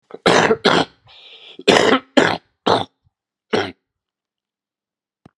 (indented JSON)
{
  "cough_length": "5.4 s",
  "cough_amplitude": 32768,
  "cough_signal_mean_std_ratio": 0.38,
  "survey_phase": "beta (2021-08-13 to 2022-03-07)",
  "age": "65+",
  "gender": "Male",
  "wearing_mask": "No",
  "symptom_cough_any": true,
  "symptom_new_continuous_cough": true,
  "symptom_runny_or_blocked_nose": true,
  "symptom_sore_throat": true,
  "symptom_fatigue": true,
  "symptom_change_to_sense_of_smell_or_taste": true,
  "symptom_loss_of_taste": true,
  "symptom_onset": "5 days",
  "smoker_status": "Never smoked",
  "respiratory_condition_asthma": false,
  "respiratory_condition_other": false,
  "recruitment_source": "Test and Trace",
  "submission_delay": "2 days",
  "covid_test_result": "Positive",
  "covid_test_method": "RT-qPCR",
  "covid_ct_value": 14.3,
  "covid_ct_gene": "N gene",
  "covid_ct_mean": 14.5,
  "covid_viral_load": "17000000 copies/ml",
  "covid_viral_load_category": "High viral load (>1M copies/ml)"
}